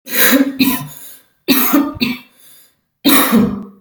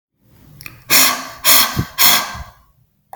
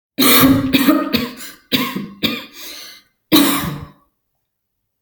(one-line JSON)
{"cough_length": "3.8 s", "cough_amplitude": 32768, "cough_signal_mean_std_ratio": 0.61, "exhalation_length": "3.2 s", "exhalation_amplitude": 32768, "exhalation_signal_mean_std_ratio": 0.47, "three_cough_length": "5.0 s", "three_cough_amplitude": 32768, "three_cough_signal_mean_std_ratio": 0.52, "survey_phase": "alpha (2021-03-01 to 2021-08-12)", "age": "45-64", "gender": "Female", "wearing_mask": "No", "symptom_fatigue": true, "symptom_onset": "12 days", "smoker_status": "Never smoked", "respiratory_condition_asthma": false, "respiratory_condition_other": false, "recruitment_source": "REACT", "submission_delay": "2 days", "covid_test_result": "Negative", "covid_test_method": "RT-qPCR"}